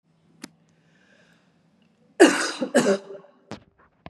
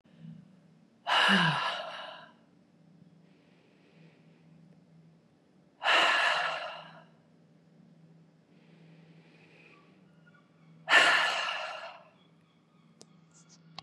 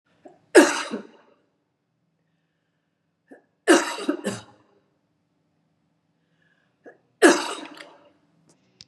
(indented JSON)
{
  "cough_length": "4.1 s",
  "cough_amplitude": 32173,
  "cough_signal_mean_std_ratio": 0.29,
  "exhalation_length": "13.8 s",
  "exhalation_amplitude": 13837,
  "exhalation_signal_mean_std_ratio": 0.36,
  "three_cough_length": "8.9 s",
  "three_cough_amplitude": 30784,
  "three_cough_signal_mean_std_ratio": 0.24,
  "survey_phase": "beta (2021-08-13 to 2022-03-07)",
  "age": "45-64",
  "gender": "Female",
  "wearing_mask": "Yes",
  "symptom_none": true,
  "smoker_status": "Never smoked",
  "respiratory_condition_asthma": false,
  "respiratory_condition_other": false,
  "recruitment_source": "REACT",
  "submission_delay": "3 days",
  "covid_test_result": "Negative",
  "covid_test_method": "RT-qPCR",
  "influenza_a_test_result": "Negative",
  "influenza_b_test_result": "Negative"
}